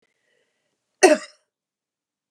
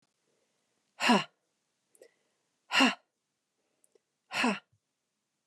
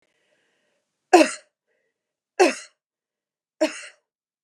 {"cough_length": "2.3 s", "cough_amplitude": 28940, "cough_signal_mean_std_ratio": 0.19, "exhalation_length": "5.5 s", "exhalation_amplitude": 9641, "exhalation_signal_mean_std_ratio": 0.27, "three_cough_length": "4.4 s", "three_cough_amplitude": 30858, "three_cough_signal_mean_std_ratio": 0.22, "survey_phase": "beta (2021-08-13 to 2022-03-07)", "age": "45-64", "gender": "Female", "wearing_mask": "No", "symptom_none": true, "smoker_status": "Never smoked", "respiratory_condition_asthma": false, "respiratory_condition_other": false, "recruitment_source": "REACT", "submission_delay": "2 days", "covid_test_result": "Negative", "covid_test_method": "RT-qPCR", "influenza_a_test_result": "Negative", "influenza_b_test_result": "Negative"}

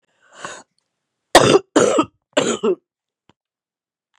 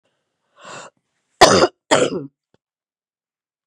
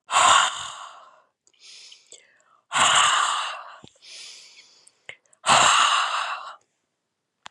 {"three_cough_length": "4.2 s", "three_cough_amplitude": 32768, "three_cough_signal_mean_std_ratio": 0.34, "cough_length": "3.7 s", "cough_amplitude": 32768, "cough_signal_mean_std_ratio": 0.28, "exhalation_length": "7.5 s", "exhalation_amplitude": 24782, "exhalation_signal_mean_std_ratio": 0.46, "survey_phase": "beta (2021-08-13 to 2022-03-07)", "age": "65+", "gender": "Female", "wearing_mask": "No", "symptom_cough_any": true, "symptom_new_continuous_cough": true, "symptom_runny_or_blocked_nose": true, "symptom_fever_high_temperature": true, "symptom_headache": true, "symptom_change_to_sense_of_smell_or_taste": true, "symptom_onset": "2 days", "smoker_status": "Ex-smoker", "respiratory_condition_asthma": false, "respiratory_condition_other": false, "recruitment_source": "Test and Trace", "submission_delay": "1 day", "covid_test_result": "Positive", "covid_test_method": "RT-qPCR", "covid_ct_value": 15.7, "covid_ct_gene": "S gene", "covid_ct_mean": 16.2, "covid_viral_load": "4700000 copies/ml", "covid_viral_load_category": "High viral load (>1M copies/ml)"}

